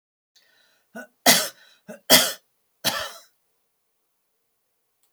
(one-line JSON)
{"cough_length": "5.1 s", "cough_amplitude": 32768, "cough_signal_mean_std_ratio": 0.25, "survey_phase": "alpha (2021-03-01 to 2021-08-12)", "age": "65+", "gender": "Female", "wearing_mask": "No", "symptom_none": true, "smoker_status": "Never smoked", "respiratory_condition_asthma": false, "respiratory_condition_other": false, "recruitment_source": "REACT", "submission_delay": "5 days", "covid_test_result": "Negative", "covid_test_method": "RT-qPCR"}